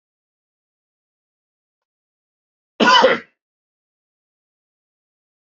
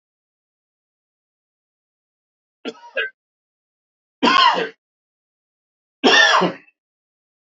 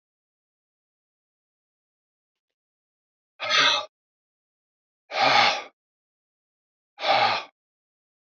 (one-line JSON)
{"cough_length": "5.5 s", "cough_amplitude": 27421, "cough_signal_mean_std_ratio": 0.21, "three_cough_length": "7.5 s", "three_cough_amplitude": 31277, "three_cough_signal_mean_std_ratio": 0.3, "exhalation_length": "8.4 s", "exhalation_amplitude": 17238, "exhalation_signal_mean_std_ratio": 0.31, "survey_phase": "alpha (2021-03-01 to 2021-08-12)", "age": "45-64", "gender": "Male", "wearing_mask": "No", "symptom_cough_any": true, "symptom_fatigue": true, "symptom_headache": true, "smoker_status": "Never smoked", "respiratory_condition_asthma": false, "respiratory_condition_other": false, "recruitment_source": "Test and Trace", "submission_delay": "1 day", "covid_test_result": "Positive", "covid_test_method": "RT-qPCR", "covid_ct_value": 23.9, "covid_ct_gene": "ORF1ab gene", "covid_ct_mean": 24.7, "covid_viral_load": "8200 copies/ml", "covid_viral_load_category": "Minimal viral load (< 10K copies/ml)"}